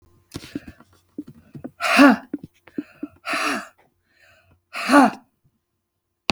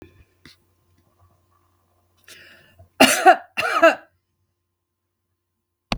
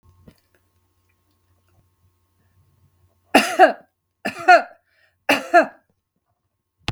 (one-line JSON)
{"exhalation_length": "6.3 s", "exhalation_amplitude": 32766, "exhalation_signal_mean_std_ratio": 0.31, "cough_length": "6.0 s", "cough_amplitude": 32768, "cough_signal_mean_std_ratio": 0.25, "three_cough_length": "6.9 s", "three_cough_amplitude": 32768, "three_cough_signal_mean_std_ratio": 0.25, "survey_phase": "beta (2021-08-13 to 2022-03-07)", "age": "65+", "gender": "Female", "wearing_mask": "No", "symptom_none": true, "smoker_status": "Never smoked", "respiratory_condition_asthma": false, "respiratory_condition_other": false, "recruitment_source": "REACT", "submission_delay": "2 days", "covid_test_result": "Negative", "covid_test_method": "RT-qPCR", "influenza_a_test_result": "Negative", "influenza_b_test_result": "Negative"}